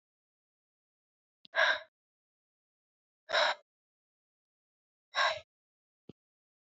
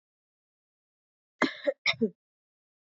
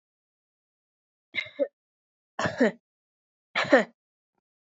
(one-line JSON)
{"exhalation_length": "6.7 s", "exhalation_amplitude": 6092, "exhalation_signal_mean_std_ratio": 0.25, "cough_length": "3.0 s", "cough_amplitude": 10692, "cough_signal_mean_std_ratio": 0.25, "three_cough_length": "4.6 s", "three_cough_amplitude": 20371, "three_cough_signal_mean_std_ratio": 0.26, "survey_phase": "beta (2021-08-13 to 2022-03-07)", "age": "18-44", "gender": "Female", "wearing_mask": "No", "symptom_runny_or_blocked_nose": true, "symptom_fatigue": true, "symptom_fever_high_temperature": true, "symptom_change_to_sense_of_smell_or_taste": true, "symptom_loss_of_taste": true, "symptom_onset": "4 days", "smoker_status": "Never smoked", "respiratory_condition_asthma": false, "respiratory_condition_other": false, "recruitment_source": "Test and Trace", "submission_delay": "2 days", "covid_test_result": "Positive", "covid_test_method": "RT-qPCR", "covid_ct_value": 17.4, "covid_ct_gene": "ORF1ab gene", "covid_ct_mean": 17.9, "covid_viral_load": "1400000 copies/ml", "covid_viral_load_category": "High viral load (>1M copies/ml)"}